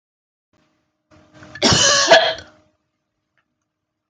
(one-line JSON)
{"cough_length": "4.1 s", "cough_amplitude": 30029, "cough_signal_mean_std_ratio": 0.34, "survey_phase": "alpha (2021-03-01 to 2021-08-12)", "age": "18-44", "gender": "Female", "wearing_mask": "No", "symptom_none": true, "symptom_onset": "12 days", "smoker_status": "Ex-smoker", "respiratory_condition_asthma": false, "respiratory_condition_other": true, "recruitment_source": "REACT", "submission_delay": "1 day", "covid_test_result": "Negative", "covid_test_method": "RT-qPCR"}